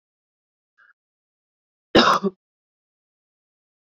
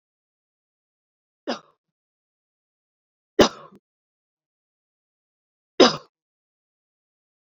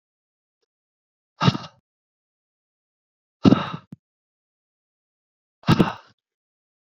{"cough_length": "3.8 s", "cough_amplitude": 27258, "cough_signal_mean_std_ratio": 0.21, "three_cough_length": "7.4 s", "three_cough_amplitude": 32768, "three_cough_signal_mean_std_ratio": 0.14, "exhalation_length": "7.0 s", "exhalation_amplitude": 27395, "exhalation_signal_mean_std_ratio": 0.2, "survey_phase": "beta (2021-08-13 to 2022-03-07)", "age": "45-64", "gender": "Female", "wearing_mask": "No", "symptom_cough_any": true, "symptom_abdominal_pain": true, "symptom_fatigue": true, "symptom_fever_high_temperature": true, "symptom_headache": true, "symptom_change_to_sense_of_smell_or_taste": true, "smoker_status": "Never smoked", "respiratory_condition_asthma": false, "respiratory_condition_other": false, "recruitment_source": "Test and Trace", "submission_delay": "2 days", "covid_test_result": "Positive", "covid_test_method": "RT-qPCR", "covid_ct_value": 21.0, "covid_ct_gene": "N gene", "covid_ct_mean": 21.7, "covid_viral_load": "75000 copies/ml", "covid_viral_load_category": "Low viral load (10K-1M copies/ml)"}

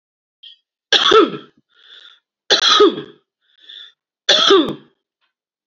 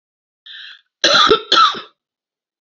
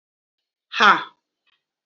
{"three_cough_length": "5.7 s", "three_cough_amplitude": 32036, "three_cough_signal_mean_std_ratio": 0.39, "cough_length": "2.6 s", "cough_amplitude": 31905, "cough_signal_mean_std_ratio": 0.41, "exhalation_length": "1.9 s", "exhalation_amplitude": 29124, "exhalation_signal_mean_std_ratio": 0.26, "survey_phase": "alpha (2021-03-01 to 2021-08-12)", "age": "45-64", "gender": "Female", "wearing_mask": "No", "symptom_shortness_of_breath": true, "symptom_fatigue": true, "symptom_change_to_sense_of_smell_or_taste": true, "symptom_loss_of_taste": true, "smoker_status": "Ex-smoker", "respiratory_condition_asthma": false, "respiratory_condition_other": false, "recruitment_source": "Test and Trace", "submission_delay": "2 days", "covid_test_result": "Positive", "covid_test_method": "RT-qPCR"}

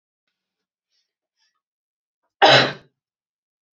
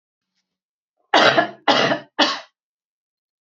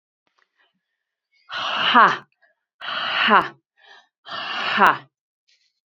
{"cough_length": "3.8 s", "cough_amplitude": 29034, "cough_signal_mean_std_ratio": 0.21, "three_cough_length": "3.5 s", "three_cough_amplitude": 32767, "three_cough_signal_mean_std_ratio": 0.37, "exhalation_length": "5.9 s", "exhalation_amplitude": 28931, "exhalation_signal_mean_std_ratio": 0.37, "survey_phase": "beta (2021-08-13 to 2022-03-07)", "age": "18-44", "gender": "Female", "wearing_mask": "No", "symptom_cough_any": true, "symptom_new_continuous_cough": true, "symptom_sore_throat": true, "symptom_fatigue": true, "symptom_headache": true, "smoker_status": "Never smoked", "respiratory_condition_asthma": false, "respiratory_condition_other": false, "recruitment_source": "Test and Trace", "submission_delay": "-1 day", "covid_test_result": "Positive", "covid_test_method": "LFT"}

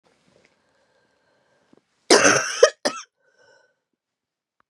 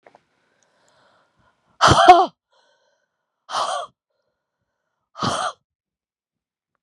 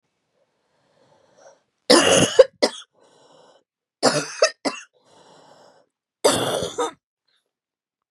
{"cough_length": "4.7 s", "cough_amplitude": 32309, "cough_signal_mean_std_ratio": 0.25, "exhalation_length": "6.8 s", "exhalation_amplitude": 32768, "exhalation_signal_mean_std_ratio": 0.25, "three_cough_length": "8.1 s", "three_cough_amplitude": 32768, "three_cough_signal_mean_std_ratio": 0.31, "survey_phase": "beta (2021-08-13 to 2022-03-07)", "age": "45-64", "gender": "Female", "wearing_mask": "No", "symptom_cough_any": true, "symptom_runny_or_blocked_nose": true, "symptom_sore_throat": true, "symptom_fatigue": true, "symptom_fever_high_temperature": true, "symptom_headache": true, "smoker_status": "Never smoked", "respiratory_condition_asthma": false, "respiratory_condition_other": false, "recruitment_source": "Test and Trace", "submission_delay": "1 day", "covid_test_result": "Positive", "covid_test_method": "LFT"}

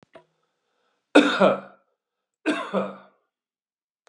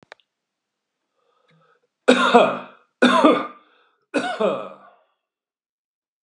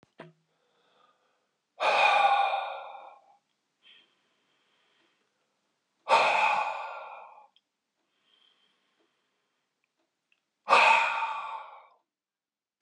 {"cough_length": "4.1 s", "cough_amplitude": 27441, "cough_signal_mean_std_ratio": 0.3, "three_cough_length": "6.2 s", "three_cough_amplitude": 31041, "three_cough_signal_mean_std_ratio": 0.35, "exhalation_length": "12.8 s", "exhalation_amplitude": 15738, "exhalation_signal_mean_std_ratio": 0.36, "survey_phase": "beta (2021-08-13 to 2022-03-07)", "age": "45-64", "gender": "Male", "wearing_mask": "No", "symptom_none": true, "smoker_status": "Prefer not to say", "respiratory_condition_asthma": false, "respiratory_condition_other": false, "recruitment_source": "REACT", "submission_delay": "1 day", "covid_test_result": "Negative", "covid_test_method": "RT-qPCR", "influenza_a_test_result": "Negative", "influenza_b_test_result": "Negative"}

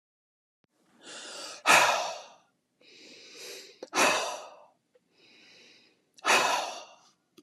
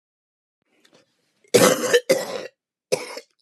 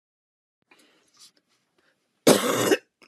{"exhalation_length": "7.4 s", "exhalation_amplitude": 15688, "exhalation_signal_mean_std_ratio": 0.37, "three_cough_length": "3.4 s", "three_cough_amplitude": 27768, "three_cough_signal_mean_std_ratio": 0.35, "cough_length": "3.1 s", "cough_amplitude": 24979, "cough_signal_mean_std_ratio": 0.29, "survey_phase": "beta (2021-08-13 to 2022-03-07)", "age": "45-64", "gender": "Female", "wearing_mask": "No", "symptom_fatigue": true, "symptom_onset": "12 days", "smoker_status": "Never smoked", "respiratory_condition_asthma": false, "respiratory_condition_other": false, "recruitment_source": "REACT", "submission_delay": "1 day", "covid_test_result": "Negative", "covid_test_method": "RT-qPCR"}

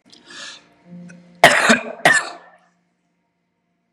{"cough_length": "3.9 s", "cough_amplitude": 32768, "cough_signal_mean_std_ratio": 0.32, "survey_phase": "beta (2021-08-13 to 2022-03-07)", "age": "18-44", "gender": "Male", "wearing_mask": "No", "symptom_none": true, "smoker_status": "Never smoked", "respiratory_condition_asthma": false, "respiratory_condition_other": false, "recruitment_source": "REACT", "submission_delay": "1 day", "covid_test_result": "Negative", "covid_test_method": "RT-qPCR", "influenza_a_test_result": "Negative", "influenza_b_test_result": "Negative"}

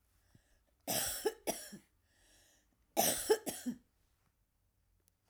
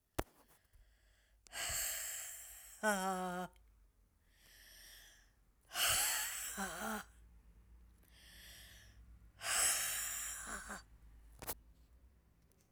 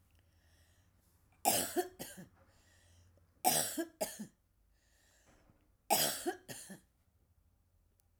{"cough_length": "5.3 s", "cough_amplitude": 4785, "cough_signal_mean_std_ratio": 0.35, "exhalation_length": "12.7 s", "exhalation_amplitude": 6090, "exhalation_signal_mean_std_ratio": 0.51, "three_cough_length": "8.2 s", "three_cough_amplitude": 7458, "three_cough_signal_mean_std_ratio": 0.34, "survey_phase": "alpha (2021-03-01 to 2021-08-12)", "age": "65+", "gender": "Female", "wearing_mask": "No", "symptom_cough_any": true, "symptom_onset": "12 days", "smoker_status": "Ex-smoker", "respiratory_condition_asthma": false, "respiratory_condition_other": false, "recruitment_source": "REACT", "submission_delay": "2 days", "covid_test_result": "Negative", "covid_test_method": "RT-qPCR"}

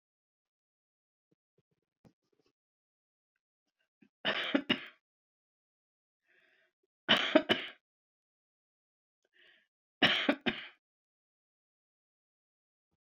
{"three_cough_length": "13.1 s", "three_cough_amplitude": 10568, "three_cough_signal_mean_std_ratio": 0.22, "survey_phase": "beta (2021-08-13 to 2022-03-07)", "age": "65+", "gender": "Female", "wearing_mask": "No", "symptom_runny_or_blocked_nose": true, "smoker_status": "Never smoked", "respiratory_condition_asthma": false, "respiratory_condition_other": false, "recruitment_source": "REACT", "submission_delay": "1 day", "covid_test_result": "Negative", "covid_test_method": "RT-qPCR"}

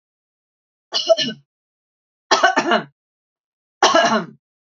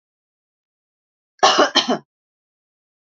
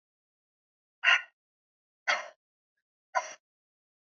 {"three_cough_length": "4.8 s", "three_cough_amplitude": 32767, "three_cough_signal_mean_std_ratio": 0.38, "cough_length": "3.1 s", "cough_amplitude": 30598, "cough_signal_mean_std_ratio": 0.29, "exhalation_length": "4.2 s", "exhalation_amplitude": 12901, "exhalation_signal_mean_std_ratio": 0.22, "survey_phase": "alpha (2021-03-01 to 2021-08-12)", "age": "45-64", "gender": "Female", "wearing_mask": "No", "symptom_none": true, "smoker_status": "Never smoked", "respiratory_condition_asthma": false, "respiratory_condition_other": false, "recruitment_source": "REACT", "submission_delay": "1 day", "covid_test_result": "Negative", "covid_test_method": "RT-qPCR"}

